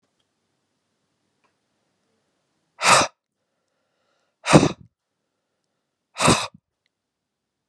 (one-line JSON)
{"exhalation_length": "7.7 s", "exhalation_amplitude": 32768, "exhalation_signal_mean_std_ratio": 0.22, "survey_phase": "beta (2021-08-13 to 2022-03-07)", "age": "65+", "gender": "Male", "wearing_mask": "No", "symptom_cough_any": true, "symptom_onset": "12 days", "smoker_status": "Never smoked", "respiratory_condition_asthma": false, "respiratory_condition_other": false, "recruitment_source": "REACT", "submission_delay": "4 days", "covid_test_result": "Negative", "covid_test_method": "RT-qPCR", "influenza_a_test_result": "Negative", "influenza_b_test_result": "Negative"}